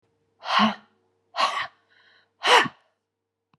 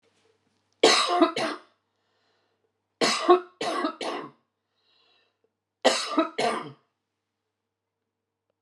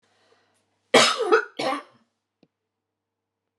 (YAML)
exhalation_length: 3.6 s
exhalation_amplitude: 19859
exhalation_signal_mean_std_ratio: 0.35
three_cough_length: 8.6 s
three_cough_amplitude: 20971
three_cough_signal_mean_std_ratio: 0.36
cough_length: 3.6 s
cough_amplitude: 28453
cough_signal_mean_std_ratio: 0.31
survey_phase: beta (2021-08-13 to 2022-03-07)
age: 65+
gender: Female
wearing_mask: 'No'
symptom_none: true
smoker_status: Never smoked
respiratory_condition_asthma: true
respiratory_condition_other: false
recruitment_source: REACT
submission_delay: 2 days
covid_test_result: Negative
covid_test_method: RT-qPCR
influenza_a_test_result: Negative
influenza_b_test_result: Negative